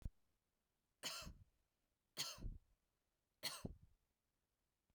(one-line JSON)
{"three_cough_length": "4.9 s", "three_cough_amplitude": 959, "three_cough_signal_mean_std_ratio": 0.36, "survey_phase": "beta (2021-08-13 to 2022-03-07)", "age": "18-44", "gender": "Female", "wearing_mask": "No", "symptom_none": true, "smoker_status": "Never smoked", "respiratory_condition_asthma": false, "respiratory_condition_other": false, "recruitment_source": "REACT", "submission_delay": "1 day", "covid_test_result": "Negative", "covid_test_method": "RT-qPCR", "influenza_a_test_result": "Negative", "influenza_b_test_result": "Negative"}